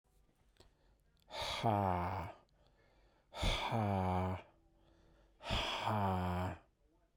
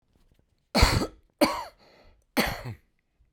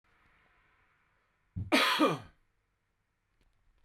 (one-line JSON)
{"exhalation_length": "7.2 s", "exhalation_amplitude": 2559, "exhalation_signal_mean_std_ratio": 0.59, "three_cough_length": "3.3 s", "three_cough_amplitude": 21676, "three_cough_signal_mean_std_ratio": 0.35, "cough_length": "3.8 s", "cough_amplitude": 8413, "cough_signal_mean_std_ratio": 0.3, "survey_phase": "beta (2021-08-13 to 2022-03-07)", "age": "45-64", "gender": "Male", "wearing_mask": "No", "symptom_none": true, "smoker_status": "Ex-smoker", "respiratory_condition_asthma": false, "respiratory_condition_other": false, "recruitment_source": "REACT", "submission_delay": "2 days", "covid_test_result": "Negative", "covid_test_method": "RT-qPCR", "influenza_a_test_result": "Negative", "influenza_b_test_result": "Negative"}